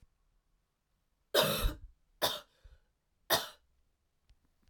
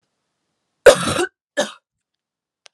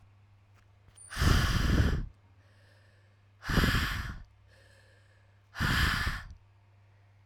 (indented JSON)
{
  "three_cough_length": "4.7 s",
  "three_cough_amplitude": 8592,
  "three_cough_signal_mean_std_ratio": 0.3,
  "cough_length": "2.7 s",
  "cough_amplitude": 32768,
  "cough_signal_mean_std_ratio": 0.25,
  "exhalation_length": "7.3 s",
  "exhalation_amplitude": 9329,
  "exhalation_signal_mean_std_ratio": 0.48,
  "survey_phase": "alpha (2021-03-01 to 2021-08-12)",
  "age": "18-44",
  "gender": "Female",
  "wearing_mask": "No",
  "symptom_cough_any": true,
  "symptom_new_continuous_cough": true,
  "symptom_shortness_of_breath": true,
  "symptom_abdominal_pain": true,
  "symptom_diarrhoea": true,
  "symptom_headache": true,
  "symptom_onset": "3 days",
  "smoker_status": "Never smoked",
  "respiratory_condition_asthma": false,
  "respiratory_condition_other": false,
  "recruitment_source": "Test and Trace",
  "submission_delay": "2 days",
  "covid_test_result": "Positive",
  "covid_test_method": "RT-qPCR",
  "covid_ct_value": 18.7,
  "covid_ct_gene": "ORF1ab gene"
}